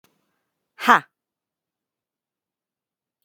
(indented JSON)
{
  "exhalation_length": "3.2 s",
  "exhalation_amplitude": 32768,
  "exhalation_signal_mean_std_ratio": 0.14,
  "survey_phase": "beta (2021-08-13 to 2022-03-07)",
  "age": "18-44",
  "gender": "Female",
  "wearing_mask": "No",
  "symptom_none": true,
  "smoker_status": "Current smoker (1 to 10 cigarettes per day)",
  "respiratory_condition_asthma": false,
  "respiratory_condition_other": false,
  "recruitment_source": "REACT",
  "submission_delay": "3 days",
  "covid_test_result": "Negative",
  "covid_test_method": "RT-qPCR"
}